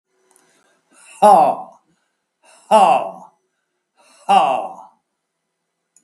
{"exhalation_length": "6.0 s", "exhalation_amplitude": 32768, "exhalation_signal_mean_std_ratio": 0.35, "survey_phase": "beta (2021-08-13 to 2022-03-07)", "age": "65+", "gender": "Male", "wearing_mask": "No", "symptom_runny_or_blocked_nose": true, "smoker_status": "Ex-smoker", "respiratory_condition_asthma": false, "respiratory_condition_other": false, "recruitment_source": "REACT", "submission_delay": "2 days", "covid_test_result": "Negative", "covid_test_method": "RT-qPCR", "influenza_a_test_result": "Negative", "influenza_b_test_result": "Negative"}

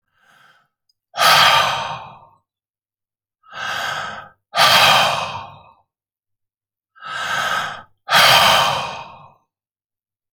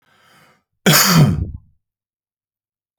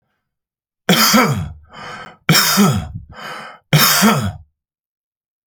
{"exhalation_length": "10.3 s", "exhalation_amplitude": 31575, "exhalation_signal_mean_std_ratio": 0.46, "cough_length": "3.0 s", "cough_amplitude": 32768, "cough_signal_mean_std_ratio": 0.37, "three_cough_length": "5.5 s", "three_cough_amplitude": 32768, "three_cough_signal_mean_std_ratio": 0.51, "survey_phase": "alpha (2021-03-01 to 2021-08-12)", "age": "45-64", "gender": "Male", "wearing_mask": "No", "symptom_none": true, "smoker_status": "Never smoked", "respiratory_condition_asthma": false, "respiratory_condition_other": false, "recruitment_source": "REACT", "submission_delay": "6 days", "covid_test_result": "Negative", "covid_test_method": "RT-qPCR"}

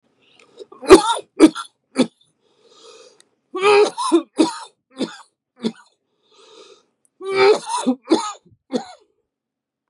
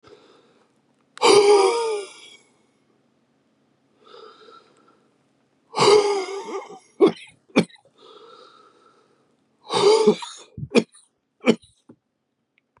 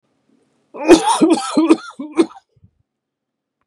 {"three_cough_length": "9.9 s", "three_cough_amplitude": 32768, "three_cough_signal_mean_std_ratio": 0.34, "exhalation_length": "12.8 s", "exhalation_amplitude": 25314, "exhalation_signal_mean_std_ratio": 0.35, "cough_length": "3.7 s", "cough_amplitude": 32768, "cough_signal_mean_std_ratio": 0.39, "survey_phase": "beta (2021-08-13 to 2022-03-07)", "age": "45-64", "gender": "Male", "wearing_mask": "No", "symptom_cough_any": true, "symptom_shortness_of_breath": true, "symptom_onset": "12 days", "smoker_status": "Never smoked", "respiratory_condition_asthma": false, "respiratory_condition_other": false, "recruitment_source": "REACT", "submission_delay": "2 days", "covid_test_result": "Negative", "covid_test_method": "RT-qPCR", "influenza_a_test_result": "Negative", "influenza_b_test_result": "Negative"}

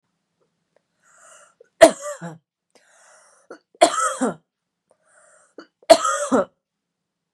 {"three_cough_length": "7.3 s", "three_cough_amplitude": 32768, "three_cough_signal_mean_std_ratio": 0.25, "survey_phase": "beta (2021-08-13 to 2022-03-07)", "age": "45-64", "gender": "Female", "wearing_mask": "No", "symptom_cough_any": true, "symptom_sore_throat": true, "symptom_onset": "4 days", "smoker_status": "Never smoked", "respiratory_condition_asthma": true, "respiratory_condition_other": false, "recruitment_source": "Test and Trace", "submission_delay": "1 day", "covid_test_result": "Positive", "covid_test_method": "RT-qPCR", "covid_ct_value": 26.8, "covid_ct_gene": "ORF1ab gene", "covid_ct_mean": 27.9, "covid_viral_load": "720 copies/ml", "covid_viral_load_category": "Minimal viral load (< 10K copies/ml)"}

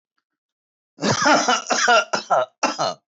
{"three_cough_length": "3.2 s", "three_cough_amplitude": 18370, "three_cough_signal_mean_std_ratio": 0.57, "survey_phase": "beta (2021-08-13 to 2022-03-07)", "age": "45-64", "gender": "Male", "wearing_mask": "No", "symptom_none": true, "smoker_status": "Current smoker (1 to 10 cigarettes per day)", "respiratory_condition_asthma": false, "respiratory_condition_other": false, "recruitment_source": "REACT", "submission_delay": "1 day", "covid_test_result": "Negative", "covid_test_method": "RT-qPCR", "influenza_a_test_result": "Negative", "influenza_b_test_result": "Negative"}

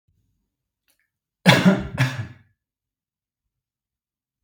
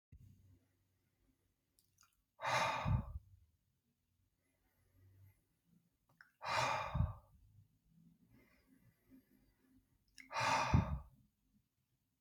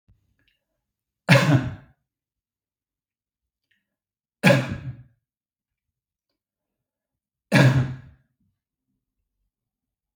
{"cough_length": "4.4 s", "cough_amplitude": 32322, "cough_signal_mean_std_ratio": 0.27, "exhalation_length": "12.2 s", "exhalation_amplitude": 3292, "exhalation_signal_mean_std_ratio": 0.33, "three_cough_length": "10.2 s", "three_cough_amplitude": 32766, "three_cough_signal_mean_std_ratio": 0.25, "survey_phase": "beta (2021-08-13 to 2022-03-07)", "age": "18-44", "gender": "Male", "wearing_mask": "No", "symptom_none": true, "smoker_status": "Ex-smoker", "respiratory_condition_asthma": false, "respiratory_condition_other": false, "recruitment_source": "REACT", "submission_delay": "4 days", "covid_test_result": "Negative", "covid_test_method": "RT-qPCR"}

